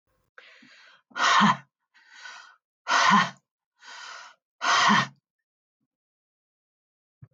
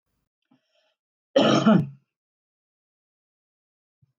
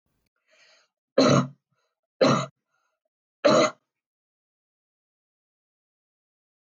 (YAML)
exhalation_length: 7.3 s
exhalation_amplitude: 13395
exhalation_signal_mean_std_ratio: 0.35
cough_length: 4.2 s
cough_amplitude: 15762
cough_signal_mean_std_ratio: 0.27
three_cough_length: 6.7 s
three_cough_amplitude: 14910
three_cough_signal_mean_std_ratio: 0.27
survey_phase: beta (2021-08-13 to 2022-03-07)
age: 45-64
gender: Female
wearing_mask: 'No'
symptom_none: true
symptom_onset: 11 days
smoker_status: Ex-smoker
respiratory_condition_asthma: false
respiratory_condition_other: false
recruitment_source: REACT
submission_delay: 4 days
covid_test_result: Negative
covid_test_method: RT-qPCR